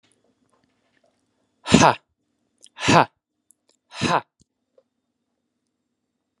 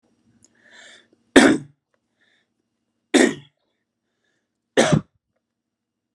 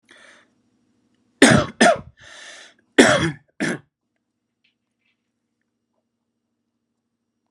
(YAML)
exhalation_length: 6.4 s
exhalation_amplitude: 32768
exhalation_signal_mean_std_ratio: 0.22
three_cough_length: 6.1 s
three_cough_amplitude: 32768
three_cough_signal_mean_std_ratio: 0.24
cough_length: 7.5 s
cough_amplitude: 32768
cough_signal_mean_std_ratio: 0.26
survey_phase: alpha (2021-03-01 to 2021-08-12)
age: 18-44
gender: Male
wearing_mask: 'No'
symptom_none: true
smoker_status: Never smoked
respiratory_condition_asthma: false
respiratory_condition_other: false
recruitment_source: REACT
submission_delay: 1 day
covid_test_result: Negative
covid_test_method: RT-qPCR